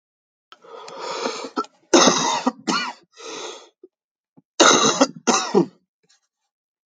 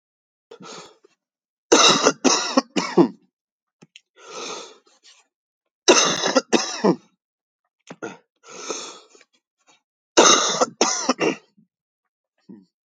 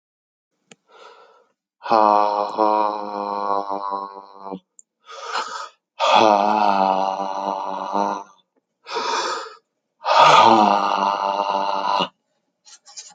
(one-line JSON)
{"cough_length": "6.9 s", "cough_amplitude": 29643, "cough_signal_mean_std_ratio": 0.41, "three_cough_length": "12.9 s", "three_cough_amplitude": 32768, "three_cough_signal_mean_std_ratio": 0.36, "exhalation_length": "13.1 s", "exhalation_amplitude": 32768, "exhalation_signal_mean_std_ratio": 0.53, "survey_phase": "beta (2021-08-13 to 2022-03-07)", "age": "18-44", "gender": "Male", "wearing_mask": "No", "symptom_new_continuous_cough": true, "symptom_sore_throat": true, "symptom_fatigue": true, "symptom_headache": true, "symptom_change_to_sense_of_smell_or_taste": true, "symptom_onset": "2 days", "smoker_status": "Never smoked", "respiratory_condition_asthma": true, "respiratory_condition_other": false, "recruitment_source": "Test and Trace", "submission_delay": "2 days", "covid_test_result": "Positive", "covid_test_method": "RT-qPCR"}